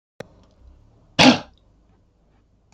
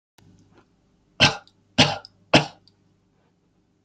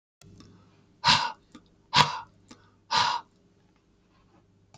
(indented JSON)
{
  "cough_length": "2.7 s",
  "cough_amplitude": 32768,
  "cough_signal_mean_std_ratio": 0.22,
  "three_cough_length": "3.8 s",
  "three_cough_amplitude": 27141,
  "three_cough_signal_mean_std_ratio": 0.24,
  "exhalation_length": "4.8 s",
  "exhalation_amplitude": 26412,
  "exhalation_signal_mean_std_ratio": 0.31,
  "survey_phase": "beta (2021-08-13 to 2022-03-07)",
  "age": "65+",
  "gender": "Male",
  "wearing_mask": "No",
  "symptom_none": true,
  "smoker_status": "Never smoked",
  "respiratory_condition_asthma": false,
  "respiratory_condition_other": false,
  "recruitment_source": "REACT",
  "submission_delay": "2 days",
  "covid_test_result": "Negative",
  "covid_test_method": "RT-qPCR",
  "influenza_a_test_result": "Negative",
  "influenza_b_test_result": "Negative"
}